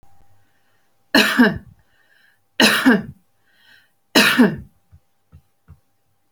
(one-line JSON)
{"three_cough_length": "6.3 s", "three_cough_amplitude": 32536, "three_cough_signal_mean_std_ratio": 0.35, "survey_phase": "beta (2021-08-13 to 2022-03-07)", "age": "65+", "gender": "Female", "wearing_mask": "No", "symptom_none": true, "smoker_status": "Never smoked", "respiratory_condition_asthma": false, "respiratory_condition_other": false, "recruitment_source": "REACT", "submission_delay": "1 day", "covid_test_result": "Negative", "covid_test_method": "RT-qPCR"}